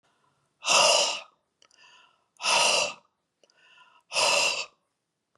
{
  "exhalation_length": "5.4 s",
  "exhalation_amplitude": 12587,
  "exhalation_signal_mean_std_ratio": 0.44,
  "survey_phase": "beta (2021-08-13 to 2022-03-07)",
  "age": "45-64",
  "gender": "Female",
  "wearing_mask": "No",
  "symptom_none": true,
  "smoker_status": "Never smoked",
  "respiratory_condition_asthma": false,
  "respiratory_condition_other": false,
  "recruitment_source": "REACT",
  "submission_delay": "3 days",
  "covid_test_result": "Negative",
  "covid_test_method": "RT-qPCR"
}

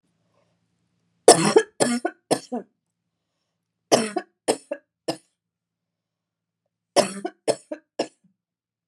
{
  "three_cough_length": "8.9 s",
  "three_cough_amplitude": 32767,
  "three_cough_signal_mean_std_ratio": 0.26,
  "survey_phase": "alpha (2021-03-01 to 2021-08-12)",
  "age": "45-64",
  "gender": "Female",
  "wearing_mask": "No",
  "symptom_cough_any": true,
  "smoker_status": "Ex-smoker",
  "respiratory_condition_asthma": false,
  "respiratory_condition_other": false,
  "recruitment_source": "REACT",
  "submission_delay": "3 days",
  "covid_test_result": "Negative",
  "covid_test_method": "RT-qPCR"
}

